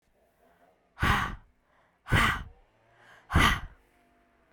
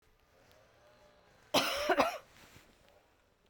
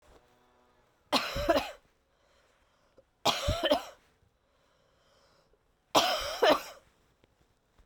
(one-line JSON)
{"exhalation_length": "4.5 s", "exhalation_amplitude": 11680, "exhalation_signal_mean_std_ratio": 0.37, "cough_length": "3.5 s", "cough_amplitude": 8151, "cough_signal_mean_std_ratio": 0.34, "three_cough_length": "7.9 s", "three_cough_amplitude": 11968, "three_cough_signal_mean_std_ratio": 0.34, "survey_phase": "beta (2021-08-13 to 2022-03-07)", "age": "18-44", "gender": "Female", "wearing_mask": "No", "symptom_cough_any": true, "symptom_runny_or_blocked_nose": true, "symptom_shortness_of_breath": true, "symptom_fatigue": true, "symptom_headache": true, "symptom_change_to_sense_of_smell_or_taste": true, "symptom_loss_of_taste": true, "smoker_status": "Never smoked", "respiratory_condition_asthma": false, "respiratory_condition_other": false, "recruitment_source": "Test and Trace", "submission_delay": "2 days", "covid_test_result": "Positive", "covid_test_method": "RT-qPCR"}